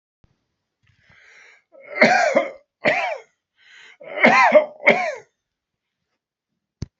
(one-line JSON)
{"three_cough_length": "7.0 s", "three_cough_amplitude": 29728, "three_cough_signal_mean_std_ratio": 0.37, "survey_phase": "beta (2021-08-13 to 2022-03-07)", "age": "65+", "gender": "Male", "wearing_mask": "No", "symptom_none": true, "smoker_status": "Ex-smoker", "respiratory_condition_asthma": false, "respiratory_condition_other": false, "recruitment_source": "REACT", "submission_delay": "2 days", "covid_test_result": "Negative", "covid_test_method": "RT-qPCR"}